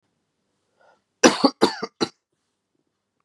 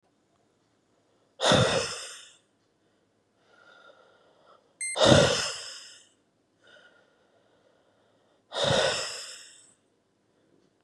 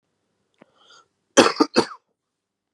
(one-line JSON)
{"three_cough_length": "3.2 s", "three_cough_amplitude": 32748, "three_cough_signal_mean_std_ratio": 0.23, "exhalation_length": "10.8 s", "exhalation_amplitude": 26577, "exhalation_signal_mean_std_ratio": 0.32, "cough_length": "2.7 s", "cough_amplitude": 32767, "cough_signal_mean_std_ratio": 0.23, "survey_phase": "beta (2021-08-13 to 2022-03-07)", "age": "18-44", "gender": "Male", "wearing_mask": "No", "symptom_new_continuous_cough": true, "symptom_runny_or_blocked_nose": true, "symptom_sore_throat": true, "smoker_status": "Never smoked", "respiratory_condition_asthma": false, "respiratory_condition_other": false, "recruitment_source": "Test and Trace", "submission_delay": "1 day", "covid_test_result": "Positive", "covid_test_method": "RT-qPCR", "covid_ct_value": 21.9, "covid_ct_gene": "ORF1ab gene", "covid_ct_mean": 22.4, "covid_viral_load": "44000 copies/ml", "covid_viral_load_category": "Low viral load (10K-1M copies/ml)"}